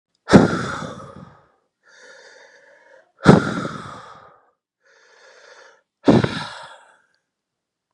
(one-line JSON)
{"exhalation_length": "7.9 s", "exhalation_amplitude": 32768, "exhalation_signal_mean_std_ratio": 0.27, "survey_phase": "beta (2021-08-13 to 2022-03-07)", "age": "18-44", "gender": "Male", "wearing_mask": "No", "symptom_new_continuous_cough": true, "symptom_runny_or_blocked_nose": true, "symptom_diarrhoea": true, "symptom_fatigue": true, "symptom_fever_high_temperature": true, "symptom_change_to_sense_of_smell_or_taste": true, "symptom_loss_of_taste": true, "symptom_onset": "4 days", "smoker_status": "Current smoker (e-cigarettes or vapes only)", "respiratory_condition_asthma": false, "respiratory_condition_other": false, "recruitment_source": "Test and Trace", "submission_delay": "1 day", "covid_test_result": "Positive", "covid_test_method": "RT-qPCR", "covid_ct_value": 19.7, "covid_ct_gene": "ORF1ab gene"}